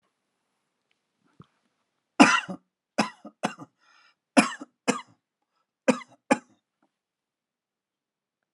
{"cough_length": "8.5 s", "cough_amplitude": 32730, "cough_signal_mean_std_ratio": 0.2, "survey_phase": "alpha (2021-03-01 to 2021-08-12)", "age": "65+", "gender": "Male", "wearing_mask": "No", "symptom_none": true, "smoker_status": "Never smoked", "respiratory_condition_asthma": false, "respiratory_condition_other": false, "recruitment_source": "REACT", "submission_delay": "1 day", "covid_test_result": "Negative", "covid_test_method": "RT-qPCR"}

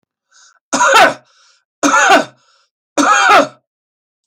{"three_cough_length": "4.3 s", "three_cough_amplitude": 32768, "three_cough_signal_mean_std_ratio": 0.48, "survey_phase": "beta (2021-08-13 to 2022-03-07)", "age": "65+", "gender": "Male", "wearing_mask": "No", "symptom_sore_throat": true, "symptom_fatigue": true, "smoker_status": "Never smoked", "respiratory_condition_asthma": true, "respiratory_condition_other": false, "recruitment_source": "REACT", "submission_delay": "1 day", "covid_test_result": "Negative", "covid_test_method": "RT-qPCR"}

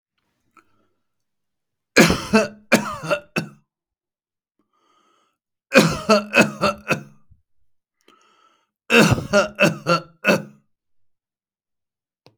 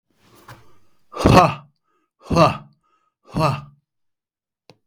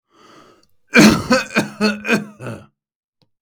{"three_cough_length": "12.4 s", "three_cough_amplitude": 32768, "three_cough_signal_mean_std_ratio": 0.33, "exhalation_length": "4.9 s", "exhalation_amplitude": 32768, "exhalation_signal_mean_std_ratio": 0.31, "cough_length": "3.4 s", "cough_amplitude": 32768, "cough_signal_mean_std_ratio": 0.4, "survey_phase": "beta (2021-08-13 to 2022-03-07)", "age": "65+", "gender": "Male", "wearing_mask": "No", "symptom_none": true, "smoker_status": "Never smoked", "respiratory_condition_asthma": false, "respiratory_condition_other": false, "recruitment_source": "REACT", "submission_delay": "2 days", "covid_test_result": "Negative", "covid_test_method": "RT-qPCR"}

